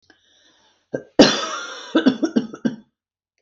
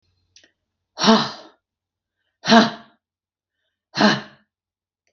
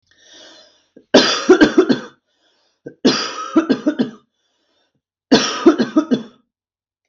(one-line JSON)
{"cough_length": "3.4 s", "cough_amplitude": 32768, "cough_signal_mean_std_ratio": 0.35, "exhalation_length": "5.1 s", "exhalation_amplitude": 32768, "exhalation_signal_mean_std_ratio": 0.28, "three_cough_length": "7.1 s", "three_cough_amplitude": 32768, "three_cough_signal_mean_std_ratio": 0.4, "survey_phase": "beta (2021-08-13 to 2022-03-07)", "age": "45-64", "gender": "Female", "wearing_mask": "No", "symptom_none": true, "smoker_status": "Ex-smoker", "respiratory_condition_asthma": false, "respiratory_condition_other": false, "recruitment_source": "REACT", "submission_delay": "6 days", "covid_test_result": "Negative", "covid_test_method": "RT-qPCR", "influenza_a_test_result": "Negative", "influenza_b_test_result": "Negative"}